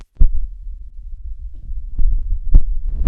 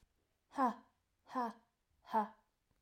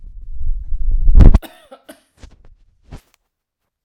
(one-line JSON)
{"three_cough_length": "3.1 s", "three_cough_amplitude": 32768, "three_cough_signal_mean_std_ratio": 0.63, "exhalation_length": "2.8 s", "exhalation_amplitude": 2076, "exhalation_signal_mean_std_ratio": 0.35, "cough_length": "3.8 s", "cough_amplitude": 32768, "cough_signal_mean_std_ratio": 0.41, "survey_phase": "alpha (2021-03-01 to 2021-08-12)", "age": "45-64", "gender": "Female", "wearing_mask": "No", "symptom_none": true, "smoker_status": "Never smoked", "respiratory_condition_asthma": true, "respiratory_condition_other": false, "recruitment_source": "REACT", "submission_delay": "7 days", "covid_test_result": "Negative", "covid_test_method": "RT-qPCR"}